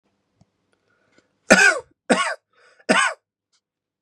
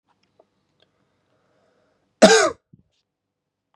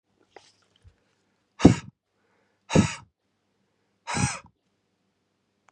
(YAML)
three_cough_length: 4.0 s
three_cough_amplitude: 32768
three_cough_signal_mean_std_ratio: 0.32
cough_length: 3.8 s
cough_amplitude: 32768
cough_signal_mean_std_ratio: 0.21
exhalation_length: 5.7 s
exhalation_amplitude: 31815
exhalation_signal_mean_std_ratio: 0.2
survey_phase: beta (2021-08-13 to 2022-03-07)
age: 18-44
gender: Male
wearing_mask: 'No'
symptom_cough_any: true
symptom_shortness_of_breath: true
symptom_fatigue: true
symptom_fever_high_temperature: true
symptom_headache: true
symptom_change_to_sense_of_smell_or_taste: true
symptom_loss_of_taste: true
smoker_status: Current smoker (e-cigarettes or vapes only)
respiratory_condition_asthma: false
respiratory_condition_other: false
recruitment_source: Test and Trace
submission_delay: 2 days
covid_test_result: Positive
covid_test_method: LFT